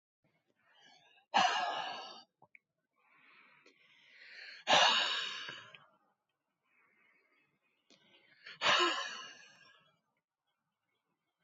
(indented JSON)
{
  "exhalation_length": "11.4 s",
  "exhalation_amplitude": 6506,
  "exhalation_signal_mean_std_ratio": 0.32,
  "survey_phase": "beta (2021-08-13 to 2022-03-07)",
  "age": "45-64",
  "gender": "Female",
  "wearing_mask": "No",
  "symptom_cough_any": true,
  "symptom_onset": "3 days",
  "smoker_status": "Never smoked",
  "respiratory_condition_asthma": false,
  "respiratory_condition_other": false,
  "recruitment_source": "Test and Trace",
  "submission_delay": "2 days",
  "covid_test_result": "Positive",
  "covid_test_method": "ePCR"
}